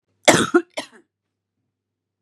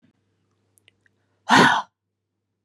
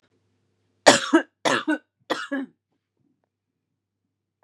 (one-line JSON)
{"cough_length": "2.2 s", "cough_amplitude": 32768, "cough_signal_mean_std_ratio": 0.27, "exhalation_length": "2.6 s", "exhalation_amplitude": 25913, "exhalation_signal_mean_std_ratio": 0.27, "three_cough_length": "4.4 s", "three_cough_amplitude": 32768, "three_cough_signal_mean_std_ratio": 0.27, "survey_phase": "beta (2021-08-13 to 2022-03-07)", "age": "18-44", "gender": "Female", "wearing_mask": "No", "symptom_cough_any": true, "symptom_runny_or_blocked_nose": true, "symptom_fatigue": true, "symptom_onset": "2 days", "smoker_status": "Ex-smoker", "respiratory_condition_asthma": false, "respiratory_condition_other": false, "recruitment_source": "Test and Trace", "submission_delay": "1 day", "covid_test_result": "Positive", "covid_test_method": "RT-qPCR", "covid_ct_value": 24.8, "covid_ct_gene": "ORF1ab gene"}